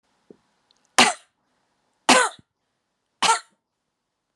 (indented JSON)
{
  "three_cough_length": "4.4 s",
  "three_cough_amplitude": 32737,
  "three_cough_signal_mean_std_ratio": 0.26,
  "survey_phase": "alpha (2021-03-01 to 2021-08-12)",
  "age": "45-64",
  "gender": "Female",
  "wearing_mask": "No",
  "symptom_none": true,
  "smoker_status": "Never smoked",
  "respiratory_condition_asthma": false,
  "respiratory_condition_other": false,
  "recruitment_source": "REACT",
  "submission_delay": "3 days",
  "covid_test_result": "Negative",
  "covid_test_method": "RT-qPCR"
}